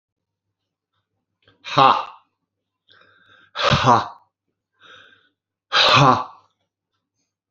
exhalation_length: 7.5 s
exhalation_amplitude: 29115
exhalation_signal_mean_std_ratio: 0.32
survey_phase: beta (2021-08-13 to 2022-03-07)
age: 65+
gender: Male
wearing_mask: 'No'
symptom_runny_or_blocked_nose: true
symptom_headache: true
symptom_onset: 4 days
smoker_status: Never smoked
respiratory_condition_asthma: true
respiratory_condition_other: false
recruitment_source: REACT
submission_delay: 1 day
covid_test_result: Negative
covid_test_method: RT-qPCR
influenza_a_test_result: Negative
influenza_b_test_result: Negative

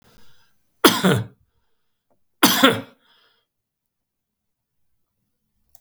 cough_length: 5.8 s
cough_amplitude: 32768
cough_signal_mean_std_ratio: 0.26
survey_phase: beta (2021-08-13 to 2022-03-07)
age: 65+
gender: Male
wearing_mask: 'No'
symptom_none: true
smoker_status: Never smoked
respiratory_condition_asthma: false
respiratory_condition_other: false
recruitment_source: REACT
submission_delay: 3 days
covid_test_result: Negative
covid_test_method: RT-qPCR
influenza_a_test_result: Negative
influenza_b_test_result: Negative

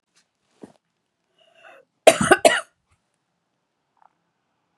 cough_length: 4.8 s
cough_amplitude: 32768
cough_signal_mean_std_ratio: 0.19
survey_phase: beta (2021-08-13 to 2022-03-07)
age: 18-44
gender: Female
wearing_mask: 'No'
symptom_none: true
symptom_onset: 12 days
smoker_status: Current smoker (1 to 10 cigarettes per day)
respiratory_condition_asthma: false
respiratory_condition_other: false
recruitment_source: REACT
submission_delay: 4 days
covid_test_result: Negative
covid_test_method: RT-qPCR
influenza_a_test_result: Negative
influenza_b_test_result: Negative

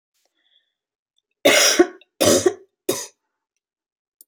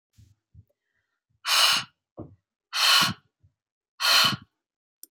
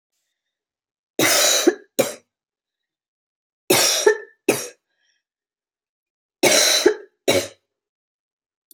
cough_length: 4.3 s
cough_amplitude: 26823
cough_signal_mean_std_ratio: 0.34
exhalation_length: 5.1 s
exhalation_amplitude: 15346
exhalation_signal_mean_std_ratio: 0.38
three_cough_length: 8.7 s
three_cough_amplitude: 27433
three_cough_signal_mean_std_ratio: 0.37
survey_phase: beta (2021-08-13 to 2022-03-07)
age: 18-44
gender: Female
wearing_mask: 'No'
symptom_cough_any: true
symptom_other: true
smoker_status: Never smoked
respiratory_condition_asthma: false
respiratory_condition_other: false
recruitment_source: Test and Trace
submission_delay: 2 days
covid_test_result: Positive
covid_test_method: RT-qPCR
covid_ct_value: 35.1
covid_ct_gene: N gene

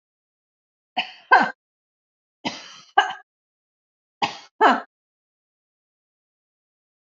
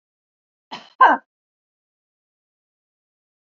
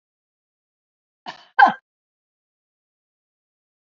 three_cough_length: 7.1 s
three_cough_amplitude: 27540
three_cough_signal_mean_std_ratio: 0.23
exhalation_length: 3.4 s
exhalation_amplitude: 26915
exhalation_signal_mean_std_ratio: 0.18
cough_length: 3.9 s
cough_amplitude: 30317
cough_signal_mean_std_ratio: 0.15
survey_phase: beta (2021-08-13 to 2022-03-07)
age: 45-64
gender: Female
wearing_mask: 'No'
symptom_none: true
smoker_status: Never smoked
respiratory_condition_asthma: false
respiratory_condition_other: false
recruitment_source: REACT
submission_delay: 3 days
covid_test_result: Negative
covid_test_method: RT-qPCR
influenza_a_test_result: Negative
influenza_b_test_result: Negative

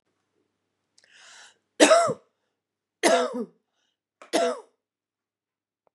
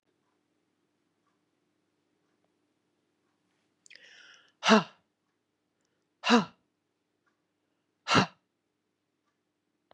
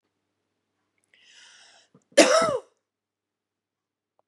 three_cough_length: 5.9 s
three_cough_amplitude: 26594
three_cough_signal_mean_std_ratio: 0.3
exhalation_length: 9.9 s
exhalation_amplitude: 14513
exhalation_signal_mean_std_ratio: 0.18
cough_length: 4.3 s
cough_amplitude: 31339
cough_signal_mean_std_ratio: 0.23
survey_phase: beta (2021-08-13 to 2022-03-07)
age: 45-64
gender: Female
wearing_mask: 'No'
symptom_none: true
symptom_onset: 13 days
smoker_status: Ex-smoker
respiratory_condition_asthma: false
respiratory_condition_other: false
recruitment_source: REACT
submission_delay: 2 days
covid_test_result: Negative
covid_test_method: RT-qPCR
influenza_a_test_result: Negative
influenza_b_test_result: Negative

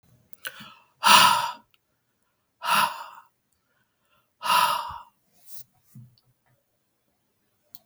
exhalation_length: 7.9 s
exhalation_amplitude: 31598
exhalation_signal_mean_std_ratio: 0.3
survey_phase: beta (2021-08-13 to 2022-03-07)
age: 65+
gender: Female
wearing_mask: 'No'
symptom_none: true
smoker_status: Never smoked
respiratory_condition_asthma: false
respiratory_condition_other: false
recruitment_source: REACT
submission_delay: 2 days
covid_test_result: Negative
covid_test_method: RT-qPCR
influenza_a_test_result: Negative
influenza_b_test_result: Negative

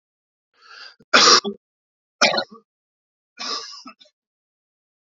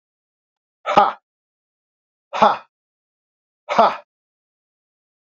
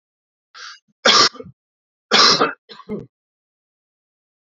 three_cough_length: 5.0 s
three_cough_amplitude: 29033
three_cough_signal_mean_std_ratio: 0.28
exhalation_length: 5.3 s
exhalation_amplitude: 30116
exhalation_signal_mean_std_ratio: 0.25
cough_length: 4.5 s
cough_amplitude: 32767
cough_signal_mean_std_ratio: 0.32
survey_phase: alpha (2021-03-01 to 2021-08-12)
age: 45-64
gender: Male
wearing_mask: 'No'
symptom_cough_any: true
symptom_fatigue: true
symptom_fever_high_temperature: true
symptom_headache: true
smoker_status: Never smoked
respiratory_condition_asthma: false
respiratory_condition_other: false
recruitment_source: Test and Trace
submission_delay: 2 days
covid_test_result: Positive
covid_test_method: RT-qPCR
covid_ct_value: 26.6
covid_ct_gene: ORF1ab gene
covid_ct_mean: 27.2
covid_viral_load: 1200 copies/ml
covid_viral_load_category: Minimal viral load (< 10K copies/ml)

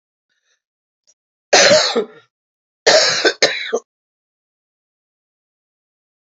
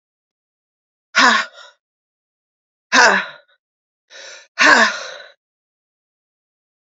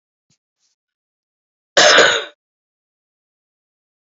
three_cough_length: 6.2 s
three_cough_amplitude: 32768
three_cough_signal_mean_std_ratio: 0.34
exhalation_length: 6.8 s
exhalation_amplitude: 31860
exhalation_signal_mean_std_ratio: 0.31
cough_length: 4.0 s
cough_amplitude: 29154
cough_signal_mean_std_ratio: 0.27
survey_phase: beta (2021-08-13 to 2022-03-07)
age: 18-44
gender: Female
wearing_mask: 'No'
symptom_cough_any: true
symptom_runny_or_blocked_nose: true
symptom_fatigue: true
symptom_headache: true
smoker_status: Ex-smoker
respiratory_condition_asthma: false
respiratory_condition_other: false
recruitment_source: Test and Trace
submission_delay: 0 days
covid_test_result: Positive
covid_test_method: LFT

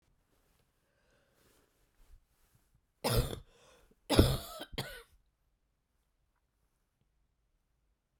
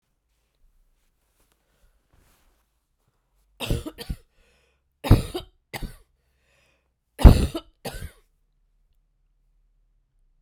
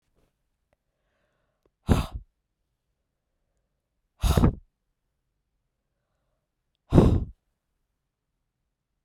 cough_length: 8.2 s
cough_amplitude: 11425
cough_signal_mean_std_ratio: 0.22
three_cough_length: 10.4 s
three_cough_amplitude: 32768
three_cough_signal_mean_std_ratio: 0.16
exhalation_length: 9.0 s
exhalation_amplitude: 23633
exhalation_signal_mean_std_ratio: 0.22
survey_phase: beta (2021-08-13 to 2022-03-07)
age: 65+
gender: Female
wearing_mask: 'No'
symptom_cough_any: true
symptom_runny_or_blocked_nose: true
symptom_shortness_of_breath: true
symptom_fever_high_temperature: true
symptom_headache: true
symptom_change_to_sense_of_smell_or_taste: true
symptom_loss_of_taste: true
symptom_onset: 5 days
smoker_status: Never smoked
respiratory_condition_asthma: false
respiratory_condition_other: false
recruitment_source: Test and Trace
submission_delay: 1 day
covid_test_result: Positive
covid_test_method: RT-qPCR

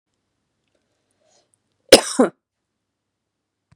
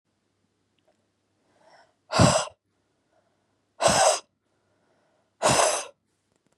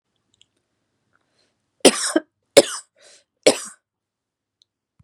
cough_length: 3.8 s
cough_amplitude: 32768
cough_signal_mean_std_ratio: 0.16
exhalation_length: 6.6 s
exhalation_amplitude: 19953
exhalation_signal_mean_std_ratio: 0.32
three_cough_length: 5.0 s
three_cough_amplitude: 32768
three_cough_signal_mean_std_ratio: 0.2
survey_phase: beta (2021-08-13 to 2022-03-07)
age: 18-44
gender: Female
wearing_mask: 'No'
symptom_abdominal_pain: true
symptom_diarrhoea: true
symptom_headache: true
symptom_other: true
smoker_status: Ex-smoker
respiratory_condition_asthma: false
respiratory_condition_other: false
recruitment_source: Test and Trace
submission_delay: 1 day
covid_test_result: Positive
covid_test_method: RT-qPCR
covid_ct_value: 28.9
covid_ct_gene: ORF1ab gene
covid_ct_mean: 29.1
covid_viral_load: 280 copies/ml
covid_viral_load_category: Minimal viral load (< 10K copies/ml)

